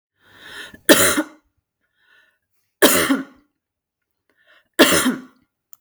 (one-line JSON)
{"three_cough_length": "5.8 s", "three_cough_amplitude": 32768, "three_cough_signal_mean_std_ratio": 0.34, "survey_phase": "beta (2021-08-13 to 2022-03-07)", "age": "45-64", "gender": "Female", "wearing_mask": "No", "symptom_none": true, "smoker_status": "Never smoked", "respiratory_condition_asthma": false, "respiratory_condition_other": false, "recruitment_source": "REACT", "submission_delay": "5 days", "covid_test_result": "Negative", "covid_test_method": "RT-qPCR", "influenza_a_test_result": "Negative", "influenza_b_test_result": "Negative"}